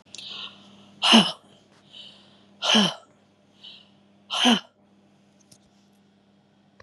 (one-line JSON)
{"exhalation_length": "6.8 s", "exhalation_amplitude": 29531, "exhalation_signal_mean_std_ratio": 0.3, "survey_phase": "beta (2021-08-13 to 2022-03-07)", "age": "45-64", "gender": "Female", "wearing_mask": "No", "symptom_none": true, "smoker_status": "Never smoked", "respiratory_condition_asthma": false, "respiratory_condition_other": false, "recruitment_source": "REACT", "submission_delay": "1 day", "covid_test_result": "Negative", "covid_test_method": "RT-qPCR", "influenza_a_test_result": "Negative", "influenza_b_test_result": "Negative"}